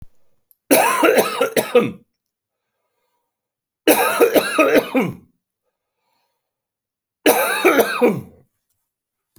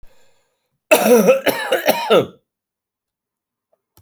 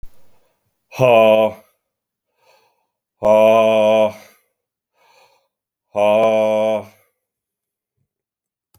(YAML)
three_cough_length: 9.4 s
three_cough_amplitude: 32767
three_cough_signal_mean_std_ratio: 0.45
cough_length: 4.0 s
cough_amplitude: 30913
cough_signal_mean_std_ratio: 0.42
exhalation_length: 8.8 s
exhalation_amplitude: 32767
exhalation_signal_mean_std_ratio: 0.45
survey_phase: alpha (2021-03-01 to 2021-08-12)
age: 45-64
gender: Male
wearing_mask: 'No'
symptom_none: true
smoker_status: Current smoker (11 or more cigarettes per day)
respiratory_condition_asthma: false
respiratory_condition_other: false
recruitment_source: REACT
submission_delay: 2 days
covid_test_result: Negative
covid_test_method: RT-qPCR